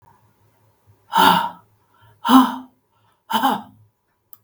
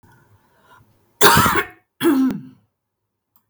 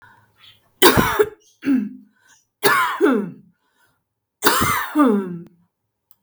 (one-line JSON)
{"exhalation_length": "4.4 s", "exhalation_amplitude": 32768, "exhalation_signal_mean_std_ratio": 0.35, "cough_length": "3.5 s", "cough_amplitude": 32768, "cough_signal_mean_std_ratio": 0.39, "three_cough_length": "6.2 s", "three_cough_amplitude": 32768, "three_cough_signal_mean_std_ratio": 0.47, "survey_phase": "beta (2021-08-13 to 2022-03-07)", "age": "45-64", "gender": "Female", "wearing_mask": "No", "symptom_cough_any": true, "symptom_shortness_of_breath": true, "smoker_status": "Ex-smoker", "respiratory_condition_asthma": true, "respiratory_condition_other": false, "recruitment_source": "REACT", "submission_delay": "4 days", "covid_test_result": "Negative", "covid_test_method": "RT-qPCR", "influenza_a_test_result": "Negative", "influenza_b_test_result": "Negative"}